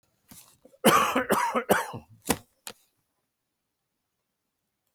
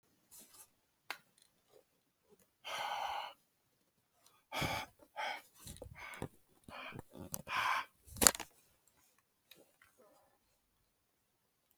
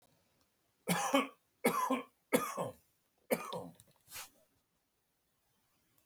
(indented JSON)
{
  "cough_length": "4.9 s",
  "cough_amplitude": 17361,
  "cough_signal_mean_std_ratio": 0.34,
  "exhalation_length": "11.8 s",
  "exhalation_amplitude": 25932,
  "exhalation_signal_mean_std_ratio": 0.29,
  "three_cough_length": "6.1 s",
  "three_cough_amplitude": 6148,
  "three_cough_signal_mean_std_ratio": 0.37,
  "survey_phase": "beta (2021-08-13 to 2022-03-07)",
  "age": "65+",
  "gender": "Male",
  "wearing_mask": "No",
  "symptom_none": true,
  "smoker_status": "Ex-smoker",
  "respiratory_condition_asthma": false,
  "respiratory_condition_other": false,
  "recruitment_source": "REACT",
  "submission_delay": "1 day",
  "covid_test_method": "RT-qPCR"
}